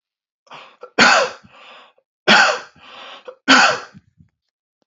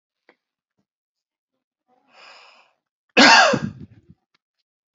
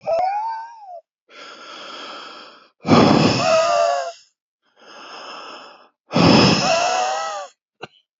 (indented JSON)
{
  "three_cough_length": "4.9 s",
  "three_cough_amplitude": 30867,
  "three_cough_signal_mean_std_ratio": 0.37,
  "cough_length": "4.9 s",
  "cough_amplitude": 29945,
  "cough_signal_mean_std_ratio": 0.24,
  "exhalation_length": "8.2 s",
  "exhalation_amplitude": 27844,
  "exhalation_signal_mean_std_ratio": 0.55,
  "survey_phase": "beta (2021-08-13 to 2022-03-07)",
  "age": "45-64",
  "gender": "Male",
  "wearing_mask": "No",
  "symptom_abdominal_pain": true,
  "symptom_other": true,
  "symptom_onset": "4 days",
  "smoker_status": "Never smoked",
  "respiratory_condition_asthma": false,
  "respiratory_condition_other": false,
  "recruitment_source": "REACT",
  "submission_delay": "0 days",
  "covid_test_result": "Negative",
  "covid_test_method": "RT-qPCR"
}